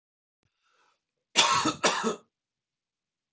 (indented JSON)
{
  "cough_length": "3.3 s",
  "cough_amplitude": 18449,
  "cough_signal_mean_std_ratio": 0.35,
  "survey_phase": "beta (2021-08-13 to 2022-03-07)",
  "age": "45-64",
  "gender": "Male",
  "wearing_mask": "No",
  "symptom_none": true,
  "smoker_status": "Ex-smoker",
  "respiratory_condition_asthma": false,
  "respiratory_condition_other": false,
  "recruitment_source": "REACT",
  "submission_delay": "3 days",
  "covid_test_result": "Negative",
  "covid_test_method": "RT-qPCR"
}